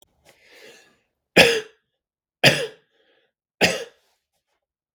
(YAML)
three_cough_length: 4.9 s
three_cough_amplitude: 32768
three_cough_signal_mean_std_ratio: 0.26
survey_phase: beta (2021-08-13 to 2022-03-07)
age: 18-44
gender: Male
wearing_mask: 'No'
symptom_cough_any: true
symptom_runny_or_blocked_nose: true
symptom_shortness_of_breath: true
symptom_fatigue: true
symptom_headache: true
symptom_change_to_sense_of_smell_or_taste: true
symptom_loss_of_taste: true
symptom_onset: 5 days
smoker_status: Never smoked
respiratory_condition_asthma: false
respiratory_condition_other: false
recruitment_source: Test and Trace
submission_delay: 5 days
covid_test_result: Positive
covid_test_method: RT-qPCR
covid_ct_value: 17.6
covid_ct_gene: ORF1ab gene
covid_ct_mean: 18.4
covid_viral_load: 910000 copies/ml
covid_viral_load_category: Low viral load (10K-1M copies/ml)